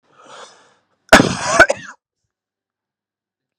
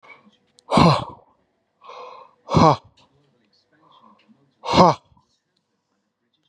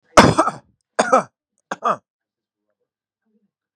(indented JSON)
{
  "cough_length": "3.6 s",
  "cough_amplitude": 32768,
  "cough_signal_mean_std_ratio": 0.26,
  "exhalation_length": "6.5 s",
  "exhalation_amplitude": 32752,
  "exhalation_signal_mean_std_ratio": 0.28,
  "three_cough_length": "3.8 s",
  "three_cough_amplitude": 32768,
  "three_cough_signal_mean_std_ratio": 0.28,
  "survey_phase": "beta (2021-08-13 to 2022-03-07)",
  "age": "18-44",
  "gender": "Male",
  "wearing_mask": "No",
  "symptom_none": true,
  "smoker_status": "Never smoked",
  "respiratory_condition_asthma": false,
  "respiratory_condition_other": false,
  "recruitment_source": "REACT",
  "submission_delay": "1 day",
  "covid_test_result": "Negative",
  "covid_test_method": "RT-qPCR"
}